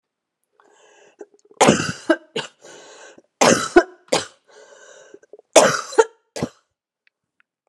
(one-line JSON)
{"three_cough_length": "7.7 s", "three_cough_amplitude": 32768, "three_cough_signal_mean_std_ratio": 0.3, "survey_phase": "beta (2021-08-13 to 2022-03-07)", "age": "45-64", "gender": "Female", "wearing_mask": "No", "symptom_cough_any": true, "symptom_runny_or_blocked_nose": true, "symptom_shortness_of_breath": true, "symptom_fatigue": true, "symptom_headache": true, "symptom_change_to_sense_of_smell_or_taste": true, "symptom_loss_of_taste": true, "symptom_onset": "4 days", "smoker_status": "Never smoked", "respiratory_condition_asthma": false, "respiratory_condition_other": false, "recruitment_source": "Test and Trace", "submission_delay": "1 day", "covid_test_result": "Positive", "covid_test_method": "RT-qPCR", "covid_ct_value": 25.1, "covid_ct_gene": "ORF1ab gene"}